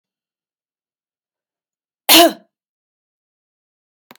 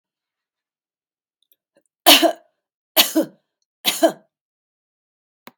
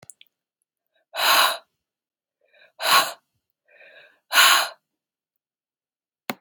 {
  "cough_length": "4.2 s",
  "cough_amplitude": 32768,
  "cough_signal_mean_std_ratio": 0.19,
  "three_cough_length": "5.6 s",
  "three_cough_amplitude": 32768,
  "three_cough_signal_mean_std_ratio": 0.25,
  "exhalation_length": "6.4 s",
  "exhalation_amplitude": 31105,
  "exhalation_signal_mean_std_ratio": 0.31,
  "survey_phase": "beta (2021-08-13 to 2022-03-07)",
  "age": "65+",
  "gender": "Female",
  "wearing_mask": "No",
  "symptom_none": true,
  "smoker_status": "Never smoked",
  "respiratory_condition_asthma": false,
  "respiratory_condition_other": false,
  "recruitment_source": "REACT",
  "submission_delay": "2 days",
  "covid_test_result": "Negative",
  "covid_test_method": "RT-qPCR",
  "influenza_a_test_result": "Unknown/Void",
  "influenza_b_test_result": "Unknown/Void"
}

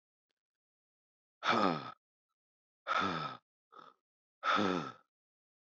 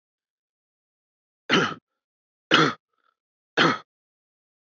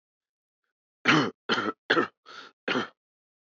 {
  "exhalation_length": "5.6 s",
  "exhalation_amplitude": 4934,
  "exhalation_signal_mean_std_ratio": 0.38,
  "three_cough_length": "4.7 s",
  "three_cough_amplitude": 23282,
  "three_cough_signal_mean_std_ratio": 0.28,
  "cough_length": "3.5 s",
  "cough_amplitude": 16290,
  "cough_signal_mean_std_ratio": 0.37,
  "survey_phase": "beta (2021-08-13 to 2022-03-07)",
  "age": "45-64",
  "gender": "Male",
  "wearing_mask": "No",
  "symptom_cough_any": true,
  "symptom_new_continuous_cough": true,
  "symptom_runny_or_blocked_nose": true,
  "symptom_sore_throat": true,
  "symptom_fatigue": true,
  "symptom_headache": true,
  "smoker_status": "Never smoked",
  "respiratory_condition_asthma": false,
  "respiratory_condition_other": false,
  "recruitment_source": "Test and Trace",
  "submission_delay": "2 days",
  "covid_test_result": "Positive",
  "covid_test_method": "LFT"
}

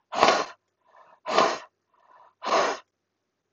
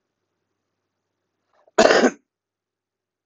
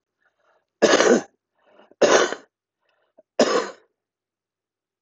{
  "exhalation_length": "3.5 s",
  "exhalation_amplitude": 26028,
  "exhalation_signal_mean_std_ratio": 0.4,
  "cough_length": "3.3 s",
  "cough_amplitude": 25812,
  "cough_signal_mean_std_ratio": 0.24,
  "three_cough_length": "5.0 s",
  "three_cough_amplitude": 25002,
  "three_cough_signal_mean_std_ratio": 0.34,
  "survey_phase": "beta (2021-08-13 to 2022-03-07)",
  "age": "45-64",
  "gender": "Male",
  "wearing_mask": "No",
  "symptom_none": true,
  "smoker_status": "Current smoker (11 or more cigarettes per day)",
  "respiratory_condition_asthma": false,
  "respiratory_condition_other": false,
  "recruitment_source": "REACT",
  "submission_delay": "2 days",
  "covid_test_result": "Negative",
  "covid_test_method": "RT-qPCR",
  "influenza_a_test_result": "Negative",
  "influenza_b_test_result": "Negative"
}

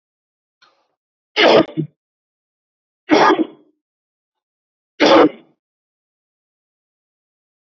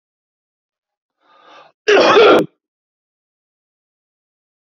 {
  "three_cough_length": "7.7 s",
  "three_cough_amplitude": 32768,
  "three_cough_signal_mean_std_ratio": 0.29,
  "cough_length": "4.8 s",
  "cough_amplitude": 28861,
  "cough_signal_mean_std_ratio": 0.3,
  "survey_phase": "beta (2021-08-13 to 2022-03-07)",
  "age": "45-64",
  "gender": "Male",
  "wearing_mask": "No",
  "symptom_none": true,
  "smoker_status": "Ex-smoker",
  "respiratory_condition_asthma": false,
  "respiratory_condition_other": false,
  "recruitment_source": "REACT",
  "submission_delay": "3 days",
  "covid_test_result": "Negative",
  "covid_test_method": "RT-qPCR",
  "influenza_a_test_result": "Negative",
  "influenza_b_test_result": "Negative"
}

